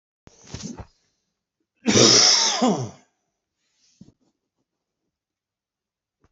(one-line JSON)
{"cough_length": "6.3 s", "cough_amplitude": 25571, "cough_signal_mean_std_ratio": 0.32, "survey_phase": "beta (2021-08-13 to 2022-03-07)", "age": "45-64", "gender": "Male", "wearing_mask": "No", "symptom_cough_any": true, "symptom_runny_or_blocked_nose": true, "symptom_change_to_sense_of_smell_or_taste": true, "symptom_loss_of_taste": true, "smoker_status": "Never smoked", "respiratory_condition_asthma": false, "respiratory_condition_other": false, "recruitment_source": "Test and Trace", "submission_delay": "2 days", "covid_test_result": "Positive", "covid_test_method": "LFT"}